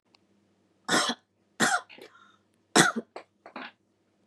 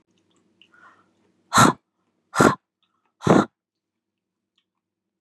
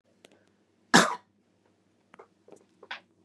three_cough_length: 4.3 s
three_cough_amplitude: 20856
three_cough_signal_mean_std_ratio: 0.31
exhalation_length: 5.2 s
exhalation_amplitude: 29061
exhalation_signal_mean_std_ratio: 0.25
cough_length: 3.2 s
cough_amplitude: 22851
cough_signal_mean_std_ratio: 0.19
survey_phase: beta (2021-08-13 to 2022-03-07)
age: 18-44
gender: Female
wearing_mask: 'No'
symptom_runny_or_blocked_nose: true
symptom_onset: 2 days
smoker_status: Never smoked
respiratory_condition_asthma: false
respiratory_condition_other: false
recruitment_source: Test and Trace
submission_delay: 1 day
covid_test_result: Negative
covid_test_method: RT-qPCR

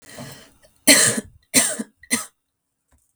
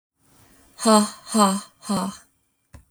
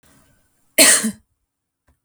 three_cough_length: 3.2 s
three_cough_amplitude: 32768
three_cough_signal_mean_std_ratio: 0.35
exhalation_length: 2.9 s
exhalation_amplitude: 26314
exhalation_signal_mean_std_ratio: 0.41
cough_length: 2.0 s
cough_amplitude: 32768
cough_signal_mean_std_ratio: 0.3
survey_phase: beta (2021-08-13 to 2022-03-07)
age: 18-44
gender: Female
wearing_mask: 'No'
symptom_fatigue: true
symptom_onset: 12 days
smoker_status: Never smoked
respiratory_condition_asthma: false
respiratory_condition_other: false
recruitment_source: REACT
submission_delay: 0 days
covid_test_result: Negative
covid_test_method: RT-qPCR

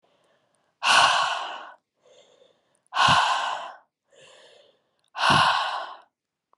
exhalation_length: 6.6 s
exhalation_amplitude: 21419
exhalation_signal_mean_std_ratio: 0.45
survey_phase: alpha (2021-03-01 to 2021-08-12)
age: 18-44
gender: Female
wearing_mask: 'No'
symptom_cough_any: true
symptom_diarrhoea: true
symptom_fever_high_temperature: true
symptom_headache: true
symptom_change_to_sense_of_smell_or_taste: true
symptom_onset: 4 days
smoker_status: Ex-smoker
respiratory_condition_asthma: true
respiratory_condition_other: false
recruitment_source: Test and Trace
submission_delay: 2 days
covid_test_result: Positive
covid_test_method: RT-qPCR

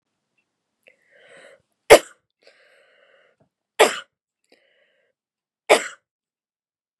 three_cough_length: 7.0 s
three_cough_amplitude: 32768
three_cough_signal_mean_std_ratio: 0.16
survey_phase: beta (2021-08-13 to 2022-03-07)
age: 18-44
gender: Female
wearing_mask: 'No'
symptom_cough_any: true
symptom_runny_or_blocked_nose: true
symptom_sore_throat: true
symptom_change_to_sense_of_smell_or_taste: true
symptom_loss_of_taste: true
symptom_onset: 2 days
smoker_status: Never smoked
respiratory_condition_asthma: false
respiratory_condition_other: false
recruitment_source: Test and Trace
submission_delay: 1 day
covid_test_result: Positive
covid_test_method: RT-qPCR
covid_ct_value: 18.1
covid_ct_gene: ORF1ab gene
covid_ct_mean: 18.3
covid_viral_load: 970000 copies/ml
covid_viral_load_category: Low viral load (10K-1M copies/ml)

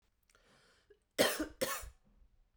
cough_length: 2.6 s
cough_amplitude: 6628
cough_signal_mean_std_ratio: 0.33
survey_phase: beta (2021-08-13 to 2022-03-07)
age: 45-64
gender: Female
wearing_mask: 'No'
symptom_runny_or_blocked_nose: true
symptom_headache: true
smoker_status: Never smoked
respiratory_condition_asthma: false
respiratory_condition_other: false
recruitment_source: Test and Trace
submission_delay: 2 days
covid_test_result: Positive
covid_test_method: RT-qPCR
covid_ct_value: 27.4
covid_ct_gene: ORF1ab gene
covid_ct_mean: 27.8
covid_viral_load: 780 copies/ml
covid_viral_load_category: Minimal viral load (< 10K copies/ml)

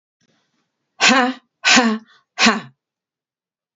exhalation_length: 3.8 s
exhalation_amplitude: 32768
exhalation_signal_mean_std_ratio: 0.37
survey_phase: beta (2021-08-13 to 2022-03-07)
age: 45-64
gender: Female
wearing_mask: 'No'
symptom_fatigue: true
smoker_status: Never smoked
respiratory_condition_asthma: false
respiratory_condition_other: false
recruitment_source: REACT
submission_delay: 3 days
covid_test_result: Negative
covid_test_method: RT-qPCR
influenza_a_test_result: Negative
influenza_b_test_result: Negative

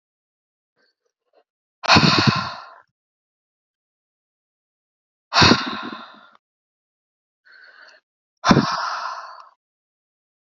exhalation_length: 10.5 s
exhalation_amplitude: 32768
exhalation_signal_mean_std_ratio: 0.29
survey_phase: alpha (2021-03-01 to 2021-08-12)
age: 45-64
gender: Female
wearing_mask: 'No'
symptom_cough_any: true
symptom_new_continuous_cough: true
symptom_fatigue: true
symptom_fever_high_temperature: true
symptom_headache: true
symptom_onset: 2 days
smoker_status: Never smoked
respiratory_condition_asthma: false
respiratory_condition_other: false
recruitment_source: Test and Trace
submission_delay: 2 days
covid_test_result: Positive
covid_test_method: RT-qPCR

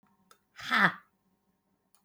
exhalation_length: 2.0 s
exhalation_amplitude: 10844
exhalation_signal_mean_std_ratio: 0.27
survey_phase: beta (2021-08-13 to 2022-03-07)
age: 45-64
gender: Female
wearing_mask: 'No'
symptom_none: true
smoker_status: Never smoked
respiratory_condition_asthma: true
respiratory_condition_other: false
recruitment_source: REACT
submission_delay: 3 days
covid_test_result: Negative
covid_test_method: RT-qPCR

